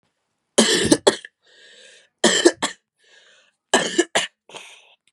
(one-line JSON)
{"three_cough_length": "5.1 s", "three_cough_amplitude": 32767, "three_cough_signal_mean_std_ratio": 0.36, "survey_phase": "beta (2021-08-13 to 2022-03-07)", "age": "18-44", "gender": "Female", "wearing_mask": "No", "symptom_cough_any": true, "symptom_runny_or_blocked_nose": true, "symptom_sore_throat": true, "symptom_fatigue": true, "symptom_onset": "3 days", "smoker_status": "Never smoked", "respiratory_condition_asthma": false, "respiratory_condition_other": false, "recruitment_source": "Test and Trace", "submission_delay": "1 day", "covid_test_result": "Positive", "covid_test_method": "RT-qPCR", "covid_ct_value": 21.7, "covid_ct_gene": "ORF1ab gene"}